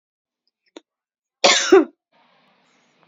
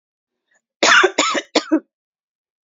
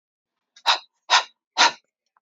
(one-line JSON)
{"cough_length": "3.1 s", "cough_amplitude": 28339, "cough_signal_mean_std_ratio": 0.26, "three_cough_length": "2.6 s", "three_cough_amplitude": 30930, "three_cough_signal_mean_std_ratio": 0.39, "exhalation_length": "2.2 s", "exhalation_amplitude": 23351, "exhalation_signal_mean_std_ratio": 0.31, "survey_phase": "beta (2021-08-13 to 2022-03-07)", "age": "45-64", "gender": "Female", "wearing_mask": "No", "symptom_none": true, "smoker_status": "Never smoked", "respiratory_condition_asthma": false, "respiratory_condition_other": false, "recruitment_source": "Test and Trace", "submission_delay": "1 day", "covid_test_result": "Negative", "covid_test_method": "RT-qPCR"}